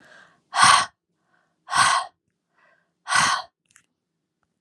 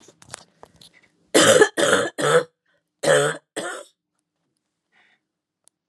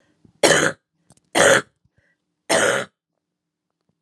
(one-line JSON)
{"exhalation_length": "4.6 s", "exhalation_amplitude": 26810, "exhalation_signal_mean_std_ratio": 0.35, "cough_length": "5.9 s", "cough_amplitude": 29646, "cough_signal_mean_std_ratio": 0.37, "three_cough_length": "4.0 s", "three_cough_amplitude": 32546, "three_cough_signal_mean_std_ratio": 0.36, "survey_phase": "alpha (2021-03-01 to 2021-08-12)", "age": "45-64", "gender": "Female", "wearing_mask": "No", "symptom_fatigue": true, "symptom_headache": true, "smoker_status": "Never smoked", "respiratory_condition_asthma": false, "respiratory_condition_other": false, "recruitment_source": "Test and Trace", "submission_delay": "2 days", "covid_test_result": "Positive", "covid_test_method": "RT-qPCR", "covid_ct_value": 14.5, "covid_ct_gene": "N gene", "covid_ct_mean": 14.6, "covid_viral_load": "16000000 copies/ml", "covid_viral_load_category": "High viral load (>1M copies/ml)"}